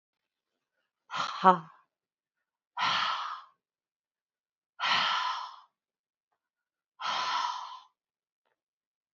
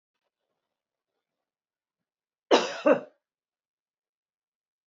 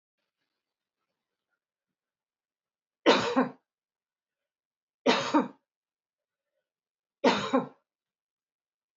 {"exhalation_length": "9.1 s", "exhalation_amplitude": 16578, "exhalation_signal_mean_std_ratio": 0.35, "cough_length": "4.9 s", "cough_amplitude": 16362, "cough_signal_mean_std_ratio": 0.19, "three_cough_length": "9.0 s", "three_cough_amplitude": 13104, "three_cough_signal_mean_std_ratio": 0.26, "survey_phase": "beta (2021-08-13 to 2022-03-07)", "age": "45-64", "gender": "Female", "wearing_mask": "No", "symptom_none": true, "smoker_status": "Ex-smoker", "respiratory_condition_asthma": false, "respiratory_condition_other": false, "recruitment_source": "REACT", "submission_delay": "2 days", "covid_test_result": "Negative", "covid_test_method": "RT-qPCR", "influenza_a_test_result": "Negative", "influenza_b_test_result": "Negative"}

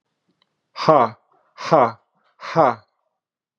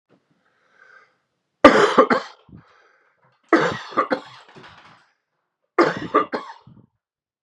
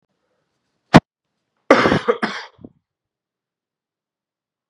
{"exhalation_length": "3.6 s", "exhalation_amplitude": 31945, "exhalation_signal_mean_std_ratio": 0.33, "three_cough_length": "7.4 s", "three_cough_amplitude": 32768, "three_cough_signal_mean_std_ratio": 0.3, "cough_length": "4.7 s", "cough_amplitude": 32768, "cough_signal_mean_std_ratio": 0.23, "survey_phase": "beta (2021-08-13 to 2022-03-07)", "age": "45-64", "gender": "Male", "wearing_mask": "No", "symptom_cough_any": true, "symptom_new_continuous_cough": true, "symptom_runny_or_blocked_nose": true, "symptom_sore_throat": true, "symptom_fever_high_temperature": true, "symptom_headache": true, "symptom_other": true, "symptom_onset": "3 days", "smoker_status": "Ex-smoker", "respiratory_condition_asthma": false, "respiratory_condition_other": false, "recruitment_source": "Test and Trace", "submission_delay": "1 day", "covid_test_result": "Positive", "covid_test_method": "RT-qPCR", "covid_ct_value": 18.3, "covid_ct_gene": "ORF1ab gene", "covid_ct_mean": 18.5, "covid_viral_load": "850000 copies/ml", "covid_viral_load_category": "Low viral load (10K-1M copies/ml)"}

